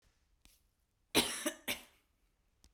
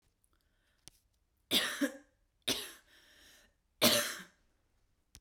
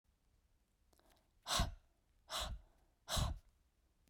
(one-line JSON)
{"cough_length": "2.7 s", "cough_amplitude": 6280, "cough_signal_mean_std_ratio": 0.29, "three_cough_length": "5.2 s", "three_cough_amplitude": 7376, "three_cough_signal_mean_std_ratio": 0.31, "exhalation_length": "4.1 s", "exhalation_amplitude": 2232, "exhalation_signal_mean_std_ratio": 0.37, "survey_phase": "beta (2021-08-13 to 2022-03-07)", "age": "18-44", "gender": "Female", "wearing_mask": "No", "symptom_none": true, "smoker_status": "Never smoked", "respiratory_condition_asthma": false, "respiratory_condition_other": false, "recruitment_source": "REACT", "submission_delay": "0 days", "covid_test_result": "Negative", "covid_test_method": "RT-qPCR", "influenza_a_test_result": "Negative", "influenza_b_test_result": "Negative"}